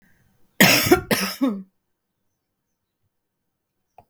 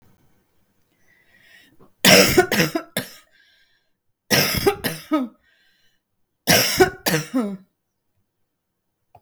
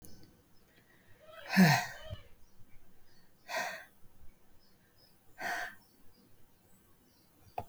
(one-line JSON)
{"cough_length": "4.1 s", "cough_amplitude": 32768, "cough_signal_mean_std_ratio": 0.32, "three_cough_length": "9.2 s", "three_cough_amplitude": 32768, "three_cough_signal_mean_std_ratio": 0.36, "exhalation_length": "7.7 s", "exhalation_amplitude": 6787, "exhalation_signal_mean_std_ratio": 0.32, "survey_phase": "beta (2021-08-13 to 2022-03-07)", "age": "45-64", "gender": "Female", "wearing_mask": "No", "symptom_cough_any": true, "symptom_onset": "13 days", "smoker_status": "Never smoked", "respiratory_condition_asthma": false, "respiratory_condition_other": false, "recruitment_source": "REACT", "submission_delay": "2 days", "covid_test_result": "Negative", "covid_test_method": "RT-qPCR", "influenza_a_test_result": "Negative", "influenza_b_test_result": "Negative"}